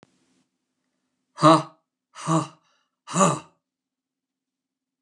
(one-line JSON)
{"exhalation_length": "5.0 s", "exhalation_amplitude": 23692, "exhalation_signal_mean_std_ratio": 0.26, "survey_phase": "beta (2021-08-13 to 2022-03-07)", "age": "65+", "gender": "Male", "wearing_mask": "No", "symptom_cough_any": true, "symptom_runny_or_blocked_nose": true, "symptom_change_to_sense_of_smell_or_taste": true, "symptom_onset": "3 days", "smoker_status": "Never smoked", "respiratory_condition_asthma": true, "respiratory_condition_other": false, "recruitment_source": "Test and Trace", "submission_delay": "1 day", "covid_test_result": "Positive", "covid_test_method": "RT-qPCR", "covid_ct_value": 16.1, "covid_ct_gene": "ORF1ab gene", "covid_ct_mean": 16.6, "covid_viral_load": "3600000 copies/ml", "covid_viral_load_category": "High viral load (>1M copies/ml)"}